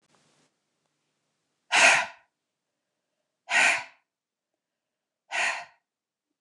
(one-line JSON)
{"exhalation_length": "6.4 s", "exhalation_amplitude": 19333, "exhalation_signal_mean_std_ratio": 0.28, "survey_phase": "beta (2021-08-13 to 2022-03-07)", "age": "45-64", "gender": "Female", "wearing_mask": "No", "symptom_fatigue": true, "symptom_headache": true, "smoker_status": "Never smoked", "respiratory_condition_asthma": false, "respiratory_condition_other": false, "recruitment_source": "REACT", "submission_delay": "2 days", "covid_test_result": "Negative", "covid_test_method": "RT-qPCR", "influenza_a_test_result": "Unknown/Void", "influenza_b_test_result": "Unknown/Void"}